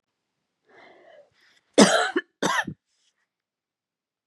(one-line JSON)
{"cough_length": "4.3 s", "cough_amplitude": 29625, "cough_signal_mean_std_ratio": 0.26, "survey_phase": "beta (2021-08-13 to 2022-03-07)", "age": "45-64", "gender": "Female", "wearing_mask": "No", "symptom_none": true, "smoker_status": "Never smoked", "respiratory_condition_asthma": true, "respiratory_condition_other": false, "recruitment_source": "REACT", "submission_delay": "2 days", "covid_test_result": "Negative", "covid_test_method": "RT-qPCR"}